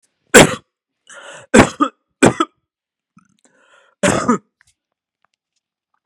{"three_cough_length": "6.1 s", "three_cough_amplitude": 32768, "three_cough_signal_mean_std_ratio": 0.27, "survey_phase": "beta (2021-08-13 to 2022-03-07)", "age": "18-44", "gender": "Male", "wearing_mask": "No", "symptom_sore_throat": true, "symptom_headache": true, "smoker_status": "Ex-smoker", "respiratory_condition_asthma": false, "respiratory_condition_other": false, "recruitment_source": "Test and Trace", "submission_delay": "2 days", "covid_test_result": "Positive", "covid_test_method": "LFT"}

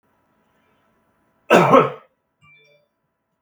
{"cough_length": "3.4 s", "cough_amplitude": 32768, "cough_signal_mean_std_ratio": 0.26, "survey_phase": "beta (2021-08-13 to 2022-03-07)", "age": "45-64", "gender": "Male", "wearing_mask": "No", "symptom_none": true, "smoker_status": "Never smoked", "respiratory_condition_asthma": true, "respiratory_condition_other": false, "recruitment_source": "REACT", "submission_delay": "1 day", "covid_test_result": "Negative", "covid_test_method": "RT-qPCR", "influenza_a_test_result": "Negative", "influenza_b_test_result": "Negative"}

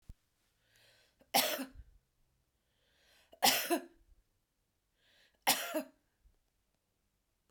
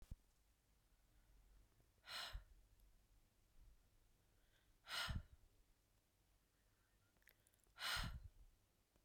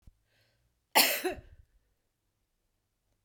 {"three_cough_length": "7.5 s", "three_cough_amplitude": 7419, "three_cough_signal_mean_std_ratio": 0.27, "exhalation_length": "9.0 s", "exhalation_amplitude": 789, "exhalation_signal_mean_std_ratio": 0.37, "cough_length": "3.2 s", "cough_amplitude": 14234, "cough_signal_mean_std_ratio": 0.24, "survey_phase": "beta (2021-08-13 to 2022-03-07)", "age": "45-64", "gender": "Female", "wearing_mask": "No", "symptom_none": true, "smoker_status": "Ex-smoker", "respiratory_condition_asthma": false, "respiratory_condition_other": false, "recruitment_source": "REACT", "submission_delay": "1 day", "covid_test_result": "Negative", "covid_test_method": "RT-qPCR"}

